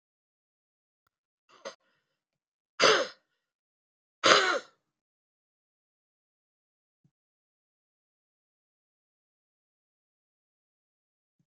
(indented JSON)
{
  "exhalation_length": "11.5 s",
  "exhalation_amplitude": 22771,
  "exhalation_signal_mean_std_ratio": 0.17,
  "survey_phase": "beta (2021-08-13 to 2022-03-07)",
  "age": "65+",
  "gender": "Female",
  "wearing_mask": "No",
  "symptom_cough_any": true,
  "symptom_runny_or_blocked_nose": true,
  "symptom_shortness_of_breath": true,
  "symptom_sore_throat": true,
  "symptom_fatigue": true,
  "symptom_fever_high_temperature": true,
  "symptom_headache": true,
  "symptom_change_to_sense_of_smell_or_taste": true,
  "symptom_loss_of_taste": true,
  "symptom_onset": "7 days",
  "smoker_status": "Current smoker (e-cigarettes or vapes only)",
  "respiratory_condition_asthma": false,
  "respiratory_condition_other": false,
  "recruitment_source": "Test and Trace",
  "submission_delay": "2 days",
  "covid_test_result": "Positive",
  "covid_test_method": "RT-qPCR",
  "covid_ct_value": 12.1,
  "covid_ct_gene": "N gene",
  "covid_ct_mean": 12.5,
  "covid_viral_load": "78000000 copies/ml",
  "covid_viral_load_category": "High viral load (>1M copies/ml)"
}